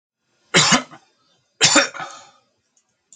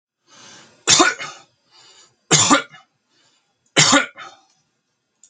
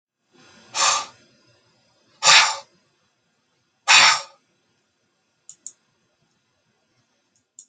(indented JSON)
{
  "cough_length": "3.2 s",
  "cough_amplitude": 32767,
  "cough_signal_mean_std_ratio": 0.34,
  "three_cough_length": "5.3 s",
  "three_cough_amplitude": 32249,
  "three_cough_signal_mean_std_ratio": 0.34,
  "exhalation_length": "7.7 s",
  "exhalation_amplitude": 32767,
  "exhalation_signal_mean_std_ratio": 0.26,
  "survey_phase": "alpha (2021-03-01 to 2021-08-12)",
  "age": "65+",
  "gender": "Male",
  "wearing_mask": "No",
  "symptom_none": true,
  "smoker_status": "Never smoked",
  "respiratory_condition_asthma": false,
  "respiratory_condition_other": false,
  "recruitment_source": "REACT",
  "submission_delay": "1 day",
  "covid_test_result": "Negative",
  "covid_test_method": "RT-qPCR"
}